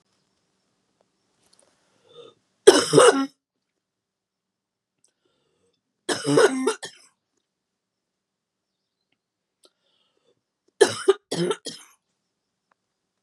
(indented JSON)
{
  "three_cough_length": "13.2 s",
  "three_cough_amplitude": 32768,
  "three_cough_signal_mean_std_ratio": 0.23,
  "survey_phase": "beta (2021-08-13 to 2022-03-07)",
  "age": "45-64",
  "gender": "Female",
  "wearing_mask": "No",
  "symptom_cough_any": true,
  "symptom_runny_or_blocked_nose": true,
  "symptom_shortness_of_breath": true,
  "symptom_sore_throat": true,
  "symptom_fatigue": true,
  "symptom_headache": true,
  "symptom_onset": "3 days",
  "smoker_status": "Never smoked",
  "respiratory_condition_asthma": false,
  "respiratory_condition_other": false,
  "recruitment_source": "Test and Trace",
  "submission_delay": "2 days",
  "covid_test_result": "Positive",
  "covid_test_method": "RT-qPCR",
  "covid_ct_value": 28.8,
  "covid_ct_gene": "ORF1ab gene",
  "covid_ct_mean": 31.5,
  "covid_viral_load": "46 copies/ml",
  "covid_viral_load_category": "Minimal viral load (< 10K copies/ml)"
}